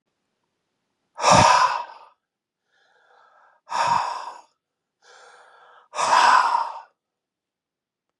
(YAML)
exhalation_length: 8.2 s
exhalation_amplitude: 28374
exhalation_signal_mean_std_ratio: 0.37
survey_phase: beta (2021-08-13 to 2022-03-07)
age: 65+
gender: Male
wearing_mask: 'No'
symptom_runny_or_blocked_nose: true
symptom_fatigue: true
symptom_headache: true
symptom_onset: 3 days
smoker_status: Never smoked
respiratory_condition_asthma: false
respiratory_condition_other: false
recruitment_source: Test and Trace
submission_delay: 2 days
covid_test_result: Positive
covid_test_method: RT-qPCR
covid_ct_value: 27.6
covid_ct_gene: N gene
covid_ct_mean: 27.7
covid_viral_load: 850 copies/ml
covid_viral_load_category: Minimal viral load (< 10K copies/ml)